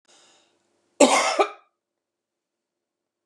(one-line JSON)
{"cough_length": "3.3 s", "cough_amplitude": 29331, "cough_signal_mean_std_ratio": 0.27, "survey_phase": "beta (2021-08-13 to 2022-03-07)", "age": "65+", "gender": "Female", "wearing_mask": "No", "symptom_none": true, "smoker_status": "Ex-smoker", "respiratory_condition_asthma": false, "respiratory_condition_other": true, "recruitment_source": "REACT", "submission_delay": "1 day", "covid_test_result": "Negative", "covid_test_method": "RT-qPCR", "influenza_a_test_result": "Negative", "influenza_b_test_result": "Negative"}